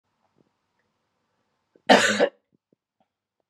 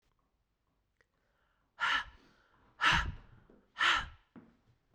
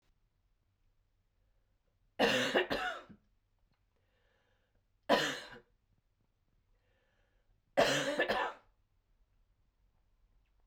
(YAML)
cough_length: 3.5 s
cough_amplitude: 27779
cough_signal_mean_std_ratio: 0.24
exhalation_length: 4.9 s
exhalation_amplitude: 5701
exhalation_signal_mean_std_ratio: 0.34
three_cough_length: 10.7 s
three_cough_amplitude: 6194
three_cough_signal_mean_std_ratio: 0.32
survey_phase: beta (2021-08-13 to 2022-03-07)
age: 45-64
gender: Female
wearing_mask: 'No'
symptom_cough_any: true
symptom_runny_or_blocked_nose: true
symptom_headache: true
smoker_status: Never smoked
respiratory_condition_asthma: false
respiratory_condition_other: false
recruitment_source: Test and Trace
submission_delay: 1 day
covid_test_result: Positive
covid_test_method: ePCR